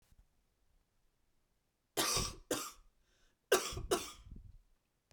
{"cough_length": "5.1 s", "cough_amplitude": 5817, "cough_signal_mean_std_ratio": 0.34, "survey_phase": "beta (2021-08-13 to 2022-03-07)", "age": "45-64", "gender": "Male", "wearing_mask": "No", "symptom_cough_any": true, "symptom_runny_or_blocked_nose": true, "symptom_fatigue": true, "symptom_headache": true, "symptom_change_to_sense_of_smell_or_taste": true, "symptom_loss_of_taste": true, "smoker_status": "Never smoked", "respiratory_condition_asthma": false, "respiratory_condition_other": false, "recruitment_source": "Test and Trace", "submission_delay": "2 days", "covid_test_result": "Positive", "covid_test_method": "RT-qPCR", "covid_ct_value": 17.1, "covid_ct_gene": "ORF1ab gene", "covid_ct_mean": 18.2, "covid_viral_load": "1100000 copies/ml", "covid_viral_load_category": "High viral load (>1M copies/ml)"}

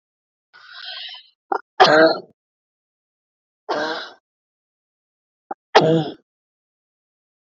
{"three_cough_length": "7.4 s", "three_cough_amplitude": 27401, "three_cough_signal_mean_std_ratio": 0.29, "survey_phase": "beta (2021-08-13 to 2022-03-07)", "age": "45-64", "gender": "Female", "wearing_mask": "No", "symptom_none": true, "smoker_status": "Ex-smoker", "respiratory_condition_asthma": true, "respiratory_condition_other": false, "recruitment_source": "REACT", "submission_delay": "3 days", "covid_test_result": "Negative", "covid_test_method": "RT-qPCR", "influenza_a_test_result": "Negative", "influenza_b_test_result": "Negative"}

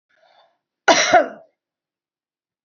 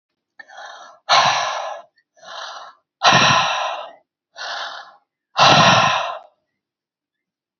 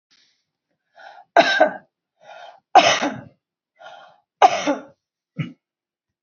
{"cough_length": "2.6 s", "cough_amplitude": 28001, "cough_signal_mean_std_ratio": 0.29, "exhalation_length": "7.6 s", "exhalation_amplitude": 29591, "exhalation_signal_mean_std_ratio": 0.45, "three_cough_length": "6.2 s", "three_cough_amplitude": 32209, "three_cough_signal_mean_std_ratio": 0.3, "survey_phase": "alpha (2021-03-01 to 2021-08-12)", "age": "65+", "gender": "Female", "wearing_mask": "No", "symptom_none": true, "smoker_status": "Never smoked", "respiratory_condition_asthma": false, "respiratory_condition_other": false, "recruitment_source": "REACT", "submission_delay": "2 days", "covid_test_result": "Negative", "covid_test_method": "RT-qPCR"}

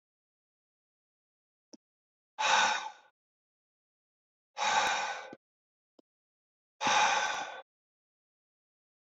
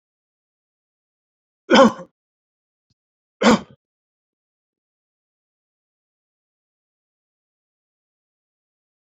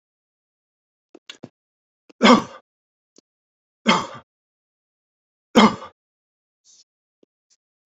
{"exhalation_length": "9.0 s", "exhalation_amplitude": 6844, "exhalation_signal_mean_std_ratio": 0.35, "cough_length": "9.1 s", "cough_amplitude": 30114, "cough_signal_mean_std_ratio": 0.16, "three_cough_length": "7.9 s", "three_cough_amplitude": 32767, "three_cough_signal_mean_std_ratio": 0.2, "survey_phase": "beta (2021-08-13 to 2022-03-07)", "age": "65+", "gender": "Male", "wearing_mask": "No", "symptom_none": true, "smoker_status": "Never smoked", "respiratory_condition_asthma": false, "respiratory_condition_other": false, "recruitment_source": "REACT", "submission_delay": "1 day", "covid_test_result": "Negative", "covid_test_method": "RT-qPCR", "influenza_a_test_result": "Negative", "influenza_b_test_result": "Negative"}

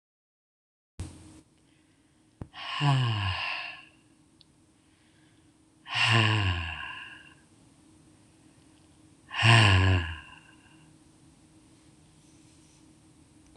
{"exhalation_length": "13.6 s", "exhalation_amplitude": 15110, "exhalation_signal_mean_std_ratio": 0.37, "survey_phase": "beta (2021-08-13 to 2022-03-07)", "age": "45-64", "gender": "Female", "wearing_mask": "No", "symptom_headache": true, "symptom_onset": "5 days", "smoker_status": "Current smoker (1 to 10 cigarettes per day)", "respiratory_condition_asthma": false, "respiratory_condition_other": false, "recruitment_source": "REACT", "submission_delay": "11 days", "covid_test_result": "Negative", "covid_test_method": "RT-qPCR"}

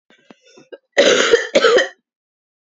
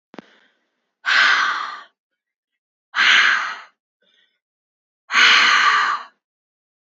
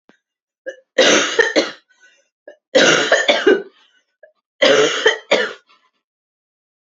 {"cough_length": "2.6 s", "cough_amplitude": 28775, "cough_signal_mean_std_ratio": 0.46, "exhalation_length": "6.8 s", "exhalation_amplitude": 29218, "exhalation_signal_mean_std_ratio": 0.46, "three_cough_length": "6.9 s", "three_cough_amplitude": 31086, "three_cough_signal_mean_std_ratio": 0.45, "survey_phase": "beta (2021-08-13 to 2022-03-07)", "age": "18-44", "gender": "Female", "wearing_mask": "No", "symptom_cough_any": true, "symptom_runny_or_blocked_nose": true, "symptom_fatigue": true, "smoker_status": "Ex-smoker", "respiratory_condition_asthma": false, "respiratory_condition_other": false, "recruitment_source": "Test and Trace", "submission_delay": "2 days", "covid_test_result": "Positive", "covid_test_method": "RT-qPCR", "covid_ct_value": 30.3, "covid_ct_gene": "ORF1ab gene", "covid_ct_mean": 30.8, "covid_viral_load": "81 copies/ml", "covid_viral_load_category": "Minimal viral load (< 10K copies/ml)"}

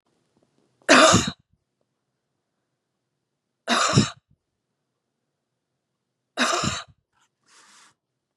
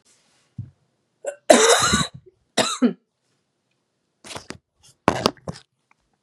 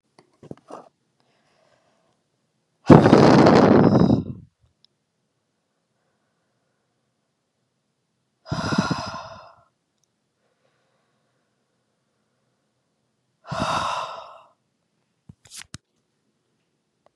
{"three_cough_length": "8.4 s", "three_cough_amplitude": 32612, "three_cough_signal_mean_std_ratio": 0.27, "cough_length": "6.2 s", "cough_amplitude": 32768, "cough_signal_mean_std_ratio": 0.31, "exhalation_length": "17.2 s", "exhalation_amplitude": 32768, "exhalation_signal_mean_std_ratio": 0.26, "survey_phase": "beta (2021-08-13 to 2022-03-07)", "age": "18-44", "gender": "Female", "wearing_mask": "No", "symptom_sore_throat": true, "symptom_fever_high_temperature": true, "symptom_onset": "2 days", "smoker_status": "Ex-smoker", "respiratory_condition_asthma": false, "respiratory_condition_other": false, "recruitment_source": "Test and Trace", "submission_delay": "1 day", "covid_test_result": "Negative", "covid_test_method": "RT-qPCR"}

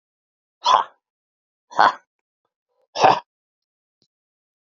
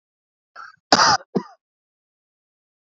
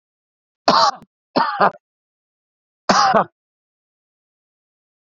{"exhalation_length": "4.7 s", "exhalation_amplitude": 30432, "exhalation_signal_mean_std_ratio": 0.25, "cough_length": "3.0 s", "cough_amplitude": 28502, "cough_signal_mean_std_ratio": 0.25, "three_cough_length": "5.1 s", "three_cough_amplitude": 29785, "three_cough_signal_mean_std_ratio": 0.32, "survey_phase": "beta (2021-08-13 to 2022-03-07)", "age": "45-64", "gender": "Male", "wearing_mask": "No", "symptom_none": true, "smoker_status": "Ex-smoker", "respiratory_condition_asthma": false, "respiratory_condition_other": false, "recruitment_source": "REACT", "submission_delay": "3 days", "covid_test_result": "Negative", "covid_test_method": "RT-qPCR", "influenza_a_test_result": "Negative", "influenza_b_test_result": "Negative"}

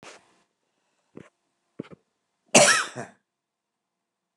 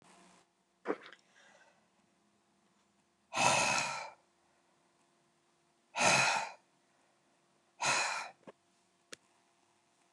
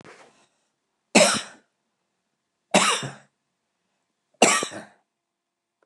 {"cough_length": "4.4 s", "cough_amplitude": 28646, "cough_signal_mean_std_ratio": 0.22, "exhalation_length": "10.1 s", "exhalation_amplitude": 8859, "exhalation_signal_mean_std_ratio": 0.34, "three_cough_length": "5.9 s", "three_cough_amplitude": 27809, "three_cough_signal_mean_std_ratio": 0.28, "survey_phase": "alpha (2021-03-01 to 2021-08-12)", "age": "65+", "gender": "Male", "wearing_mask": "No", "symptom_none": true, "smoker_status": "Never smoked", "respiratory_condition_asthma": false, "respiratory_condition_other": false, "recruitment_source": "REACT", "submission_delay": "1 day", "covid_test_result": "Negative", "covid_test_method": "RT-qPCR"}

